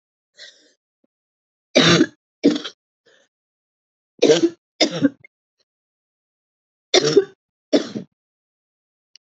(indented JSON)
{
  "three_cough_length": "9.2 s",
  "three_cough_amplitude": 28489,
  "three_cough_signal_mean_std_ratio": 0.29,
  "survey_phase": "alpha (2021-03-01 to 2021-08-12)",
  "age": "18-44",
  "gender": "Female",
  "wearing_mask": "No",
  "symptom_new_continuous_cough": true,
  "symptom_fever_high_temperature": true,
  "symptom_headache": true,
  "symptom_change_to_sense_of_smell_or_taste": true,
  "symptom_loss_of_taste": true,
  "symptom_onset": "2 days",
  "smoker_status": "Ex-smoker",
  "respiratory_condition_asthma": true,
  "respiratory_condition_other": false,
  "recruitment_source": "Test and Trace",
  "submission_delay": "1 day",
  "covid_test_result": "Positive",
  "covid_test_method": "RT-qPCR",
  "covid_ct_value": 14.9,
  "covid_ct_gene": "ORF1ab gene",
  "covid_ct_mean": 15.3,
  "covid_viral_load": "9600000 copies/ml",
  "covid_viral_load_category": "High viral load (>1M copies/ml)"
}